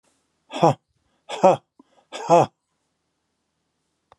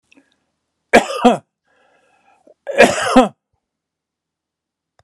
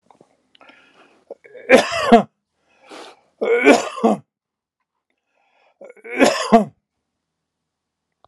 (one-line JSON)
{"exhalation_length": "4.2 s", "exhalation_amplitude": 28452, "exhalation_signal_mean_std_ratio": 0.26, "cough_length": "5.0 s", "cough_amplitude": 32768, "cough_signal_mean_std_ratio": 0.29, "three_cough_length": "8.3 s", "three_cough_amplitude": 32768, "three_cough_signal_mean_std_ratio": 0.31, "survey_phase": "alpha (2021-03-01 to 2021-08-12)", "age": "65+", "gender": "Male", "wearing_mask": "No", "symptom_none": true, "smoker_status": "Ex-smoker", "respiratory_condition_asthma": false, "respiratory_condition_other": false, "recruitment_source": "REACT", "submission_delay": "1 day", "covid_test_result": "Negative", "covid_test_method": "RT-qPCR"}